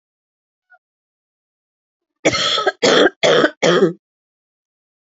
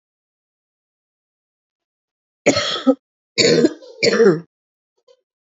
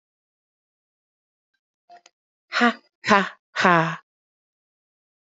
{
  "cough_length": "5.1 s",
  "cough_amplitude": 31005,
  "cough_signal_mean_std_ratio": 0.4,
  "three_cough_length": "5.5 s",
  "three_cough_amplitude": 29435,
  "three_cough_signal_mean_std_ratio": 0.35,
  "exhalation_length": "5.2 s",
  "exhalation_amplitude": 28100,
  "exhalation_signal_mean_std_ratio": 0.26,
  "survey_phase": "alpha (2021-03-01 to 2021-08-12)",
  "age": "18-44",
  "gender": "Female",
  "wearing_mask": "No",
  "symptom_cough_any": true,
  "symptom_fatigue": true,
  "symptom_headache": true,
  "symptom_onset": "3 days",
  "smoker_status": "Ex-smoker",
  "respiratory_condition_asthma": false,
  "respiratory_condition_other": false,
  "recruitment_source": "Test and Trace",
  "submission_delay": "2 days",
  "covid_test_result": "Positive",
  "covid_test_method": "RT-qPCR",
  "covid_ct_value": 29.2,
  "covid_ct_gene": "ORF1ab gene",
  "covid_ct_mean": 29.7,
  "covid_viral_load": "180 copies/ml",
  "covid_viral_load_category": "Minimal viral load (< 10K copies/ml)"
}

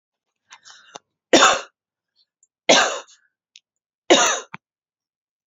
{
  "three_cough_length": "5.5 s",
  "three_cough_amplitude": 31706,
  "three_cough_signal_mean_std_ratio": 0.3,
  "survey_phase": "beta (2021-08-13 to 2022-03-07)",
  "age": "18-44",
  "gender": "Female",
  "wearing_mask": "No",
  "symptom_none": true,
  "smoker_status": "Never smoked",
  "respiratory_condition_asthma": false,
  "respiratory_condition_other": false,
  "recruitment_source": "Test and Trace",
  "submission_delay": "1 day",
  "covid_test_result": "Negative",
  "covid_test_method": "RT-qPCR"
}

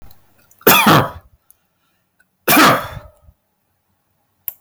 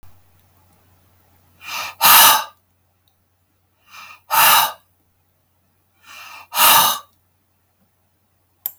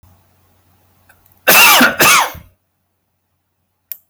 {
  "three_cough_length": "4.6 s",
  "three_cough_amplitude": 32768,
  "three_cough_signal_mean_std_ratio": 0.36,
  "exhalation_length": "8.8 s",
  "exhalation_amplitude": 32768,
  "exhalation_signal_mean_std_ratio": 0.32,
  "cough_length": "4.1 s",
  "cough_amplitude": 32768,
  "cough_signal_mean_std_ratio": 0.39,
  "survey_phase": "beta (2021-08-13 to 2022-03-07)",
  "age": "45-64",
  "gender": "Male",
  "wearing_mask": "No",
  "symptom_none": true,
  "smoker_status": "Never smoked",
  "respiratory_condition_asthma": false,
  "respiratory_condition_other": false,
  "recruitment_source": "REACT",
  "submission_delay": "2 days",
  "covid_test_result": "Negative",
  "covid_test_method": "RT-qPCR",
  "influenza_a_test_result": "Negative",
  "influenza_b_test_result": "Negative"
}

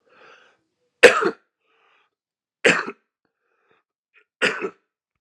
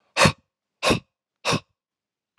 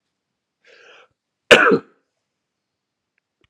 {
  "three_cough_length": "5.2 s",
  "three_cough_amplitude": 32768,
  "three_cough_signal_mean_std_ratio": 0.23,
  "exhalation_length": "2.4 s",
  "exhalation_amplitude": 24322,
  "exhalation_signal_mean_std_ratio": 0.32,
  "cough_length": "3.5 s",
  "cough_amplitude": 32768,
  "cough_signal_mean_std_ratio": 0.21,
  "survey_phase": "alpha (2021-03-01 to 2021-08-12)",
  "age": "18-44",
  "gender": "Male",
  "wearing_mask": "No",
  "symptom_cough_any": true,
  "symptom_diarrhoea": true,
  "symptom_fatigue": true,
  "symptom_headache": true,
  "symptom_change_to_sense_of_smell_or_taste": true,
  "symptom_loss_of_taste": true,
  "symptom_onset": "3 days",
  "smoker_status": "Never smoked",
  "respiratory_condition_asthma": false,
  "respiratory_condition_other": false,
  "recruitment_source": "Test and Trace",
  "submission_delay": "2 days",
  "covid_test_result": "Positive",
  "covid_test_method": "RT-qPCR",
  "covid_ct_value": 26.0,
  "covid_ct_gene": "N gene"
}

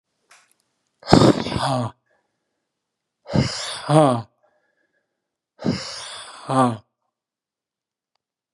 {
  "exhalation_length": "8.5 s",
  "exhalation_amplitude": 32768,
  "exhalation_signal_mean_std_ratio": 0.33,
  "survey_phase": "beta (2021-08-13 to 2022-03-07)",
  "age": "45-64",
  "gender": "Male",
  "wearing_mask": "No",
  "symptom_none": true,
  "smoker_status": "Never smoked",
  "respiratory_condition_asthma": false,
  "respiratory_condition_other": false,
  "recruitment_source": "REACT",
  "submission_delay": "2 days",
  "covid_test_method": "RT-qPCR",
  "influenza_a_test_result": "Unknown/Void",
  "influenza_b_test_result": "Unknown/Void"
}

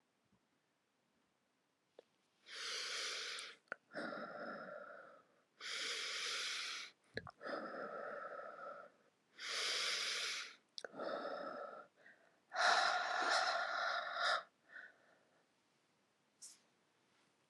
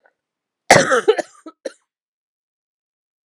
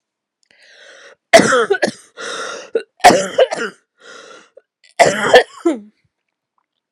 {
  "exhalation_length": "17.5 s",
  "exhalation_amplitude": 2803,
  "exhalation_signal_mean_std_ratio": 0.56,
  "cough_length": "3.2 s",
  "cough_amplitude": 32768,
  "cough_signal_mean_std_ratio": 0.26,
  "three_cough_length": "6.9 s",
  "three_cough_amplitude": 32768,
  "three_cough_signal_mean_std_ratio": 0.37,
  "survey_phase": "beta (2021-08-13 to 2022-03-07)",
  "age": "45-64",
  "gender": "Female",
  "wearing_mask": "No",
  "symptom_cough_any": true,
  "symptom_fatigue": true,
  "symptom_change_to_sense_of_smell_or_taste": true,
  "symptom_onset": "11 days",
  "smoker_status": "Never smoked",
  "respiratory_condition_asthma": false,
  "respiratory_condition_other": false,
  "recruitment_source": "REACT",
  "submission_delay": "1 day",
  "covid_test_result": "Negative",
  "covid_test_method": "RT-qPCR",
  "influenza_a_test_result": "Unknown/Void",
  "influenza_b_test_result": "Unknown/Void"
}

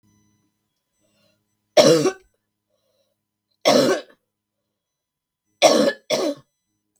{
  "three_cough_length": "7.0 s",
  "three_cough_amplitude": 32766,
  "three_cough_signal_mean_std_ratio": 0.32,
  "survey_phase": "beta (2021-08-13 to 2022-03-07)",
  "age": "45-64",
  "gender": "Female",
  "wearing_mask": "No",
  "symptom_cough_any": true,
  "smoker_status": "Never smoked",
  "respiratory_condition_asthma": false,
  "respiratory_condition_other": false,
  "recruitment_source": "REACT",
  "submission_delay": "7 days",
  "covid_test_result": "Negative",
  "covid_test_method": "RT-qPCR"
}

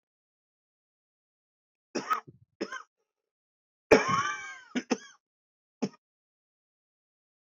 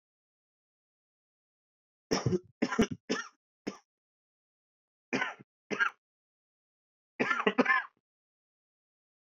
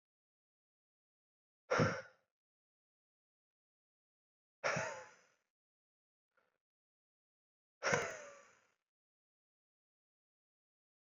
{
  "cough_length": "7.5 s",
  "cough_amplitude": 17061,
  "cough_signal_mean_std_ratio": 0.24,
  "three_cough_length": "9.4 s",
  "three_cough_amplitude": 7853,
  "three_cough_signal_mean_std_ratio": 0.29,
  "exhalation_length": "11.0 s",
  "exhalation_amplitude": 4389,
  "exhalation_signal_mean_std_ratio": 0.22,
  "survey_phase": "beta (2021-08-13 to 2022-03-07)",
  "age": "18-44",
  "gender": "Male",
  "wearing_mask": "No",
  "symptom_cough_any": true,
  "symptom_runny_or_blocked_nose": true,
  "symptom_sore_throat": true,
  "symptom_fatigue": true,
  "symptom_headache": true,
  "symptom_onset": "4 days",
  "smoker_status": "Ex-smoker",
  "respiratory_condition_asthma": false,
  "respiratory_condition_other": false,
  "recruitment_source": "Test and Trace",
  "submission_delay": "2 days",
  "covid_test_result": "Positive",
  "covid_test_method": "RT-qPCR",
  "covid_ct_value": 20.5,
  "covid_ct_gene": "N gene"
}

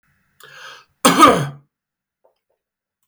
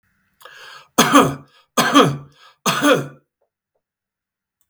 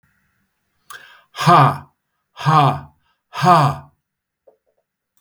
{
  "cough_length": "3.1 s",
  "cough_amplitude": 32768,
  "cough_signal_mean_std_ratio": 0.29,
  "three_cough_length": "4.7 s",
  "three_cough_amplitude": 32768,
  "three_cough_signal_mean_std_ratio": 0.38,
  "exhalation_length": "5.2 s",
  "exhalation_amplitude": 32768,
  "exhalation_signal_mean_std_ratio": 0.37,
  "survey_phase": "beta (2021-08-13 to 2022-03-07)",
  "age": "45-64",
  "gender": "Male",
  "wearing_mask": "No",
  "symptom_none": true,
  "smoker_status": "Current smoker (1 to 10 cigarettes per day)",
  "respiratory_condition_asthma": false,
  "respiratory_condition_other": false,
  "recruitment_source": "REACT",
  "submission_delay": "2 days",
  "covid_test_result": "Negative",
  "covid_test_method": "RT-qPCR"
}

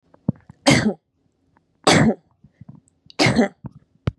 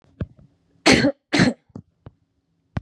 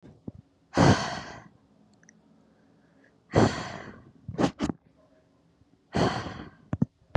{
  "three_cough_length": "4.2 s",
  "three_cough_amplitude": 32704,
  "three_cough_signal_mean_std_ratio": 0.37,
  "cough_length": "2.8 s",
  "cough_amplitude": 31791,
  "cough_signal_mean_std_ratio": 0.34,
  "exhalation_length": "7.2 s",
  "exhalation_amplitude": 16814,
  "exhalation_signal_mean_std_ratio": 0.34,
  "survey_phase": "beta (2021-08-13 to 2022-03-07)",
  "age": "18-44",
  "gender": "Female",
  "wearing_mask": "No",
  "symptom_none": true,
  "smoker_status": "Never smoked",
  "respiratory_condition_asthma": false,
  "respiratory_condition_other": false,
  "recruitment_source": "REACT",
  "submission_delay": "7 days",
  "covid_test_result": "Negative",
  "covid_test_method": "RT-qPCR",
  "influenza_a_test_result": "Negative",
  "influenza_b_test_result": "Negative"
}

